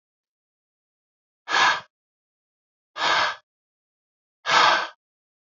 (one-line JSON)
{"exhalation_length": "5.5 s", "exhalation_amplitude": 20454, "exhalation_signal_mean_std_ratio": 0.34, "survey_phase": "beta (2021-08-13 to 2022-03-07)", "age": "18-44", "gender": "Male", "wearing_mask": "No", "symptom_none": true, "symptom_onset": "2 days", "smoker_status": "Never smoked", "respiratory_condition_asthma": false, "respiratory_condition_other": false, "recruitment_source": "REACT", "submission_delay": "1 day", "covid_test_result": "Negative", "covid_test_method": "RT-qPCR", "influenza_a_test_result": "Negative", "influenza_b_test_result": "Negative"}